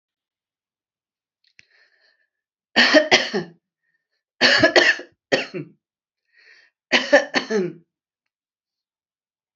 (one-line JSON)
{"three_cough_length": "9.6 s", "three_cough_amplitude": 31605, "three_cough_signal_mean_std_ratio": 0.32, "survey_phase": "alpha (2021-03-01 to 2021-08-12)", "age": "65+", "gender": "Female", "wearing_mask": "No", "symptom_cough_any": true, "symptom_fatigue": true, "symptom_fever_high_temperature": true, "symptom_headache": true, "symptom_change_to_sense_of_smell_or_taste": true, "symptom_onset": "3 days", "smoker_status": "Never smoked", "respiratory_condition_asthma": false, "respiratory_condition_other": false, "recruitment_source": "Test and Trace", "submission_delay": "2 days", "covid_test_result": "Positive", "covid_test_method": "RT-qPCR", "covid_ct_value": 15.5, "covid_ct_gene": "ORF1ab gene", "covid_ct_mean": 20.0, "covid_viral_load": "270000 copies/ml", "covid_viral_load_category": "Low viral load (10K-1M copies/ml)"}